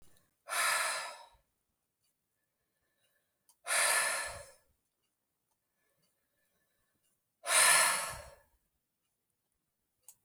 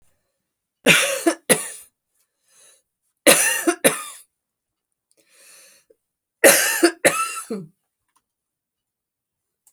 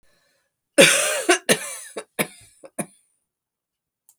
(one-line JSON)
{"exhalation_length": "10.2 s", "exhalation_amplitude": 7168, "exhalation_signal_mean_std_ratio": 0.33, "three_cough_length": "9.7 s", "three_cough_amplitude": 32768, "three_cough_signal_mean_std_ratio": 0.32, "cough_length": "4.2 s", "cough_amplitude": 32768, "cough_signal_mean_std_ratio": 0.32, "survey_phase": "alpha (2021-03-01 to 2021-08-12)", "age": "45-64", "gender": "Female", "wearing_mask": "No", "symptom_none": true, "symptom_onset": "13 days", "smoker_status": "Never smoked", "respiratory_condition_asthma": false, "respiratory_condition_other": false, "recruitment_source": "REACT", "submission_delay": "3 days", "covid_test_result": "Negative", "covid_test_method": "RT-qPCR"}